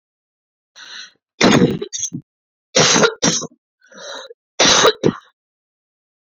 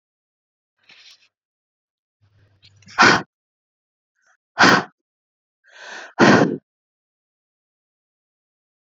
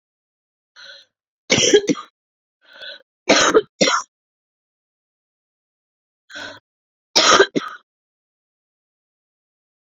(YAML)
cough_length: 6.3 s
cough_amplitude: 32768
cough_signal_mean_std_ratio: 0.41
exhalation_length: 9.0 s
exhalation_amplitude: 28761
exhalation_signal_mean_std_ratio: 0.24
three_cough_length: 9.8 s
three_cough_amplitude: 32768
three_cough_signal_mean_std_ratio: 0.29
survey_phase: beta (2021-08-13 to 2022-03-07)
age: 18-44
gender: Female
wearing_mask: 'No'
symptom_cough_any: true
symptom_runny_or_blocked_nose: true
symptom_fatigue: true
symptom_fever_high_temperature: true
symptom_change_to_sense_of_smell_or_taste: true
symptom_loss_of_taste: true
smoker_status: Never smoked
respiratory_condition_asthma: true
respiratory_condition_other: false
recruitment_source: Test and Trace
submission_delay: 2 days
covid_test_result: Positive
covid_test_method: LFT